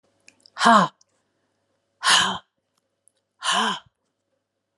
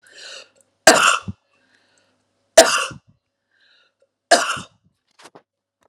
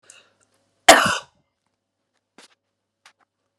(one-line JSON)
{"exhalation_length": "4.8 s", "exhalation_amplitude": 29712, "exhalation_signal_mean_std_ratio": 0.33, "three_cough_length": "5.9 s", "three_cough_amplitude": 32768, "three_cough_signal_mean_std_ratio": 0.27, "cough_length": "3.6 s", "cough_amplitude": 32768, "cough_signal_mean_std_ratio": 0.19, "survey_phase": "alpha (2021-03-01 to 2021-08-12)", "age": "45-64", "gender": "Female", "wearing_mask": "No", "symptom_none": true, "smoker_status": "Never smoked", "respiratory_condition_asthma": false, "respiratory_condition_other": false, "recruitment_source": "REACT", "submission_delay": "1 day", "covid_test_result": "Negative", "covid_test_method": "RT-qPCR"}